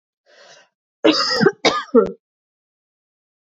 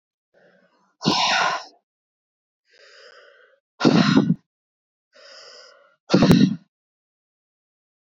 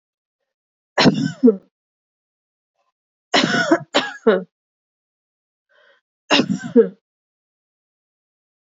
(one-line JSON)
{"cough_length": "3.6 s", "cough_amplitude": 26496, "cough_signal_mean_std_ratio": 0.35, "exhalation_length": "8.0 s", "exhalation_amplitude": 25804, "exhalation_signal_mean_std_ratio": 0.34, "three_cough_length": "8.7 s", "three_cough_amplitude": 27989, "three_cough_signal_mean_std_ratio": 0.31, "survey_phase": "beta (2021-08-13 to 2022-03-07)", "age": "18-44", "gender": "Female", "wearing_mask": "No", "symptom_none": true, "symptom_onset": "7 days", "smoker_status": "Current smoker (1 to 10 cigarettes per day)", "respiratory_condition_asthma": false, "respiratory_condition_other": false, "recruitment_source": "Test and Trace", "submission_delay": "2 days", "covid_test_result": "Positive", "covid_test_method": "RT-qPCR", "covid_ct_value": 32.2, "covid_ct_gene": "N gene"}